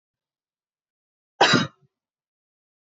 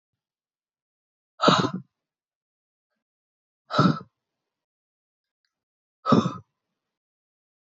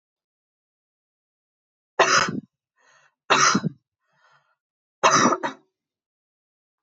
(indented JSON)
{
  "cough_length": "2.9 s",
  "cough_amplitude": 20596,
  "cough_signal_mean_std_ratio": 0.22,
  "exhalation_length": "7.7 s",
  "exhalation_amplitude": 18999,
  "exhalation_signal_mean_std_ratio": 0.24,
  "three_cough_length": "6.8 s",
  "three_cough_amplitude": 20759,
  "three_cough_signal_mean_std_ratio": 0.31,
  "survey_phase": "beta (2021-08-13 to 2022-03-07)",
  "age": "18-44",
  "gender": "Female",
  "wearing_mask": "No",
  "symptom_sore_throat": true,
  "smoker_status": "Never smoked",
  "respiratory_condition_asthma": false,
  "respiratory_condition_other": true,
  "recruitment_source": "Test and Trace",
  "submission_delay": "1 day",
  "covid_test_result": "Positive",
  "covid_test_method": "RT-qPCR",
  "covid_ct_value": 31.6,
  "covid_ct_gene": "N gene"
}